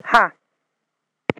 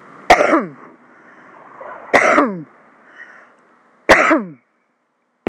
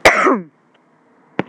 {
  "exhalation_length": "1.4 s",
  "exhalation_amplitude": 26028,
  "exhalation_signal_mean_std_ratio": 0.25,
  "three_cough_length": "5.5 s",
  "three_cough_amplitude": 26028,
  "three_cough_signal_mean_std_ratio": 0.38,
  "cough_length": "1.5 s",
  "cough_amplitude": 26028,
  "cough_signal_mean_std_ratio": 0.4,
  "survey_phase": "alpha (2021-03-01 to 2021-08-12)",
  "age": "45-64",
  "gender": "Female",
  "wearing_mask": "No",
  "symptom_none": true,
  "smoker_status": "Ex-smoker",
  "respiratory_condition_asthma": false,
  "respiratory_condition_other": false,
  "recruitment_source": "Test and Trace",
  "submission_delay": "2 days",
  "covid_test_result": "Positive",
  "covid_test_method": "RT-qPCR",
  "covid_ct_value": 37.6,
  "covid_ct_gene": "N gene"
}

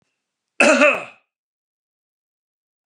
{
  "cough_length": "2.9 s",
  "cough_amplitude": 32280,
  "cough_signal_mean_std_ratio": 0.29,
  "survey_phase": "beta (2021-08-13 to 2022-03-07)",
  "age": "65+",
  "gender": "Male",
  "wearing_mask": "No",
  "symptom_none": true,
  "smoker_status": "Ex-smoker",
  "respiratory_condition_asthma": false,
  "respiratory_condition_other": false,
  "recruitment_source": "REACT",
  "submission_delay": "1 day",
  "covid_test_result": "Negative",
  "covid_test_method": "RT-qPCR",
  "influenza_a_test_result": "Negative",
  "influenza_b_test_result": "Negative"
}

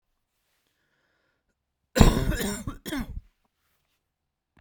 {
  "cough_length": "4.6 s",
  "cough_amplitude": 29244,
  "cough_signal_mean_std_ratio": 0.27,
  "survey_phase": "beta (2021-08-13 to 2022-03-07)",
  "age": "18-44",
  "gender": "Male",
  "wearing_mask": "No",
  "symptom_cough_any": true,
  "symptom_new_continuous_cough": true,
  "symptom_runny_or_blocked_nose": true,
  "symptom_shortness_of_breath": true,
  "symptom_abdominal_pain": true,
  "symptom_diarrhoea": true,
  "symptom_fatigue": true,
  "symptom_headache": true,
  "symptom_change_to_sense_of_smell_or_taste": true,
  "symptom_loss_of_taste": true,
  "symptom_onset": "3 days",
  "smoker_status": "Never smoked",
  "respiratory_condition_asthma": false,
  "respiratory_condition_other": false,
  "recruitment_source": "Test and Trace",
  "submission_delay": "1 day",
  "covid_test_result": "Positive",
  "covid_test_method": "RT-qPCR",
  "covid_ct_value": 18.5,
  "covid_ct_gene": "ORF1ab gene",
  "covid_ct_mean": 18.9,
  "covid_viral_load": "630000 copies/ml",
  "covid_viral_load_category": "Low viral load (10K-1M copies/ml)"
}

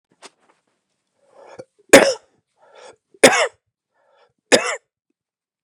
{
  "three_cough_length": "5.6 s",
  "three_cough_amplitude": 32768,
  "three_cough_signal_mean_std_ratio": 0.23,
  "survey_phase": "beta (2021-08-13 to 2022-03-07)",
  "age": "45-64",
  "gender": "Male",
  "wearing_mask": "No",
  "symptom_other": true,
  "smoker_status": "Never smoked",
  "respiratory_condition_asthma": false,
  "respiratory_condition_other": false,
  "recruitment_source": "Test and Trace",
  "submission_delay": "2 days",
  "covid_test_result": "Positive",
  "covid_test_method": "RT-qPCR",
  "covid_ct_value": 29.8,
  "covid_ct_gene": "ORF1ab gene",
  "covid_ct_mean": 30.4,
  "covid_viral_load": "110 copies/ml",
  "covid_viral_load_category": "Minimal viral load (< 10K copies/ml)"
}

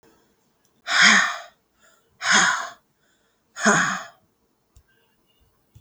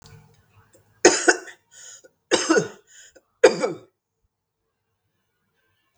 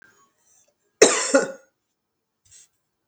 {
  "exhalation_length": "5.8 s",
  "exhalation_amplitude": 31107,
  "exhalation_signal_mean_std_ratio": 0.37,
  "three_cough_length": "6.0 s",
  "three_cough_amplitude": 32768,
  "three_cough_signal_mean_std_ratio": 0.27,
  "cough_length": "3.1 s",
  "cough_amplitude": 32768,
  "cough_signal_mean_std_ratio": 0.26,
  "survey_phase": "beta (2021-08-13 to 2022-03-07)",
  "age": "45-64",
  "gender": "Female",
  "wearing_mask": "No",
  "symptom_cough_any": true,
  "symptom_runny_or_blocked_nose": true,
  "symptom_sore_throat": true,
  "symptom_abdominal_pain": true,
  "symptom_fatigue": true,
  "symptom_headache": true,
  "symptom_other": true,
  "smoker_status": "Never smoked",
  "respiratory_condition_asthma": true,
  "respiratory_condition_other": false,
  "recruitment_source": "Test and Trace",
  "submission_delay": "2 days",
  "covid_test_result": "Positive",
  "covid_test_method": "RT-qPCR"
}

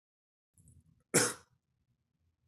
{
  "cough_length": "2.5 s",
  "cough_amplitude": 7781,
  "cough_signal_mean_std_ratio": 0.21,
  "survey_phase": "beta (2021-08-13 to 2022-03-07)",
  "age": "18-44",
  "gender": "Male",
  "wearing_mask": "No",
  "symptom_none": true,
  "symptom_onset": "6 days",
  "smoker_status": "Never smoked",
  "respiratory_condition_asthma": false,
  "respiratory_condition_other": false,
  "recruitment_source": "Test and Trace",
  "submission_delay": "2 days",
  "covid_test_result": "Positive",
  "covid_test_method": "RT-qPCR",
  "covid_ct_value": 15.8,
  "covid_ct_gene": "ORF1ab gene",
  "covid_ct_mean": 16.0,
  "covid_viral_load": "5700000 copies/ml",
  "covid_viral_load_category": "High viral load (>1M copies/ml)"
}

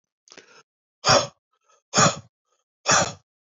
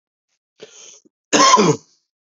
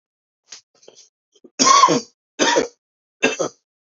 {
  "exhalation_length": "3.4 s",
  "exhalation_amplitude": 21586,
  "exhalation_signal_mean_std_ratio": 0.34,
  "cough_length": "2.4 s",
  "cough_amplitude": 30655,
  "cough_signal_mean_std_ratio": 0.36,
  "three_cough_length": "3.9 s",
  "three_cough_amplitude": 29315,
  "three_cough_signal_mean_std_ratio": 0.37,
  "survey_phase": "beta (2021-08-13 to 2022-03-07)",
  "age": "45-64",
  "gender": "Male",
  "wearing_mask": "No",
  "symptom_cough_any": true,
  "symptom_runny_or_blocked_nose": true,
  "symptom_shortness_of_breath": true,
  "symptom_fatigue": true,
  "symptom_headache": true,
  "symptom_change_to_sense_of_smell_or_taste": true,
  "symptom_onset": "3 days",
  "smoker_status": "Ex-smoker",
  "respiratory_condition_asthma": false,
  "respiratory_condition_other": false,
  "recruitment_source": "Test and Trace",
  "submission_delay": "2 days",
  "covid_test_result": "Positive",
  "covid_test_method": "ePCR"
}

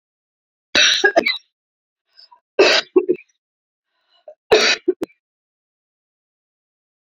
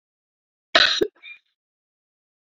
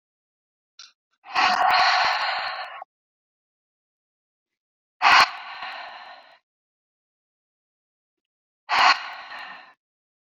{
  "three_cough_length": "7.1 s",
  "three_cough_amplitude": 29535,
  "three_cough_signal_mean_std_ratio": 0.32,
  "cough_length": "2.5 s",
  "cough_amplitude": 29396,
  "cough_signal_mean_std_ratio": 0.25,
  "exhalation_length": "10.2 s",
  "exhalation_amplitude": 24335,
  "exhalation_signal_mean_std_ratio": 0.35,
  "survey_phase": "beta (2021-08-13 to 2022-03-07)",
  "age": "45-64",
  "gender": "Female",
  "wearing_mask": "No",
  "symptom_none": true,
  "smoker_status": "Never smoked",
  "respiratory_condition_asthma": false,
  "respiratory_condition_other": false,
  "recruitment_source": "REACT",
  "submission_delay": "1 day",
  "covid_test_result": "Negative",
  "covid_test_method": "RT-qPCR"
}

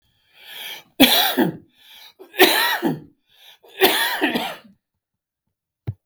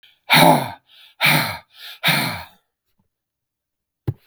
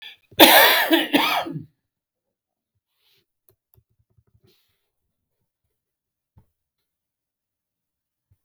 {
  "three_cough_length": "6.1 s",
  "three_cough_amplitude": 32767,
  "three_cough_signal_mean_std_ratio": 0.43,
  "exhalation_length": "4.3 s",
  "exhalation_amplitude": 32766,
  "exhalation_signal_mean_std_ratio": 0.39,
  "cough_length": "8.4 s",
  "cough_amplitude": 32768,
  "cough_signal_mean_std_ratio": 0.25,
  "survey_phase": "beta (2021-08-13 to 2022-03-07)",
  "age": "65+",
  "gender": "Male",
  "wearing_mask": "No",
  "symptom_none": true,
  "smoker_status": "Never smoked",
  "respiratory_condition_asthma": false,
  "respiratory_condition_other": false,
  "recruitment_source": "REACT",
  "submission_delay": "2 days",
  "covid_test_result": "Negative",
  "covid_test_method": "RT-qPCR"
}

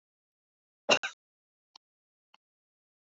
{
  "cough_length": "3.1 s",
  "cough_amplitude": 11748,
  "cough_signal_mean_std_ratio": 0.15,
  "survey_phase": "beta (2021-08-13 to 2022-03-07)",
  "age": "65+",
  "gender": "Male",
  "wearing_mask": "No",
  "symptom_none": true,
  "smoker_status": "Ex-smoker",
  "respiratory_condition_asthma": false,
  "respiratory_condition_other": false,
  "recruitment_source": "REACT",
  "submission_delay": "1 day",
  "covid_test_result": "Negative",
  "covid_test_method": "RT-qPCR"
}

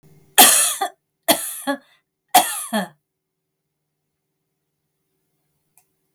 {
  "three_cough_length": "6.1 s",
  "three_cough_amplitude": 32768,
  "three_cough_signal_mean_std_ratio": 0.29,
  "survey_phase": "beta (2021-08-13 to 2022-03-07)",
  "age": "45-64",
  "gender": "Female",
  "wearing_mask": "No",
  "symptom_none": true,
  "symptom_onset": "13 days",
  "smoker_status": "Never smoked",
  "respiratory_condition_asthma": false,
  "respiratory_condition_other": false,
  "recruitment_source": "REACT",
  "submission_delay": "3 days",
  "covid_test_result": "Negative",
  "covid_test_method": "RT-qPCR",
  "influenza_a_test_result": "Negative",
  "influenza_b_test_result": "Negative"
}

